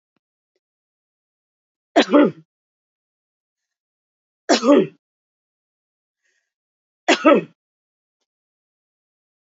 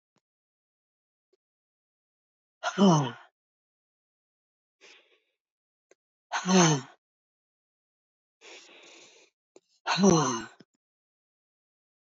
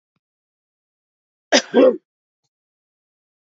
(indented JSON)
{
  "three_cough_length": "9.6 s",
  "three_cough_amplitude": 27283,
  "three_cough_signal_mean_std_ratio": 0.23,
  "exhalation_length": "12.1 s",
  "exhalation_amplitude": 11715,
  "exhalation_signal_mean_std_ratio": 0.26,
  "cough_length": "3.5 s",
  "cough_amplitude": 28006,
  "cough_signal_mean_std_ratio": 0.23,
  "survey_phase": "beta (2021-08-13 to 2022-03-07)",
  "age": "45-64",
  "gender": "Female",
  "wearing_mask": "No",
  "symptom_cough_any": true,
  "symptom_runny_or_blocked_nose": true,
  "symptom_shortness_of_breath": true,
  "symptom_sore_throat": true,
  "symptom_fatigue": true,
  "symptom_headache": true,
  "symptom_onset": "4 days",
  "smoker_status": "Ex-smoker",
  "respiratory_condition_asthma": false,
  "respiratory_condition_other": false,
  "recruitment_source": "Test and Trace",
  "submission_delay": "2 days",
  "covid_test_result": "Positive",
  "covid_test_method": "RT-qPCR",
  "covid_ct_value": 25.3,
  "covid_ct_gene": "ORF1ab gene"
}